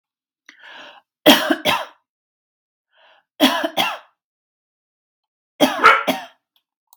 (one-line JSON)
{"three_cough_length": "7.0 s", "three_cough_amplitude": 32767, "three_cough_signal_mean_std_ratio": 0.32, "survey_phase": "beta (2021-08-13 to 2022-03-07)", "age": "45-64", "gender": "Female", "wearing_mask": "No", "symptom_none": true, "smoker_status": "Ex-smoker", "respiratory_condition_asthma": false, "respiratory_condition_other": false, "recruitment_source": "REACT", "submission_delay": "0 days", "covid_test_result": "Negative", "covid_test_method": "RT-qPCR", "influenza_a_test_result": "Negative", "influenza_b_test_result": "Negative"}